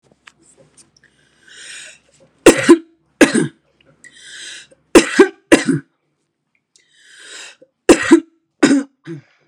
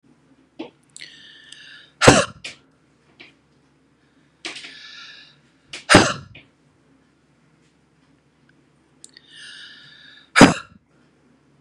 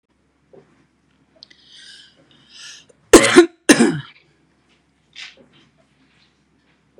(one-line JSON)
{"three_cough_length": "9.5 s", "three_cough_amplitude": 32768, "three_cough_signal_mean_std_ratio": 0.3, "exhalation_length": "11.6 s", "exhalation_amplitude": 32768, "exhalation_signal_mean_std_ratio": 0.2, "cough_length": "7.0 s", "cough_amplitude": 32768, "cough_signal_mean_std_ratio": 0.22, "survey_phase": "beta (2021-08-13 to 2022-03-07)", "age": "45-64", "gender": "Female", "wearing_mask": "No", "symptom_none": true, "symptom_onset": "12 days", "smoker_status": "Ex-smoker", "respiratory_condition_asthma": false, "respiratory_condition_other": false, "recruitment_source": "REACT", "submission_delay": "0 days", "covid_test_result": "Negative", "covid_test_method": "RT-qPCR", "influenza_a_test_result": "Negative", "influenza_b_test_result": "Negative"}